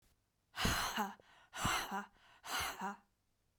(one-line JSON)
{"exhalation_length": "3.6 s", "exhalation_amplitude": 2629, "exhalation_signal_mean_std_ratio": 0.55, "survey_phase": "beta (2021-08-13 to 2022-03-07)", "age": "45-64", "gender": "Female", "wearing_mask": "No", "symptom_cough_any": true, "symptom_new_continuous_cough": true, "symptom_runny_or_blocked_nose": true, "symptom_shortness_of_breath": true, "symptom_fatigue": true, "symptom_onset": "4 days", "smoker_status": "Ex-smoker", "respiratory_condition_asthma": true, "respiratory_condition_other": false, "recruitment_source": "Test and Trace", "submission_delay": "1 day", "covid_test_result": "Negative", "covid_test_method": "RT-qPCR"}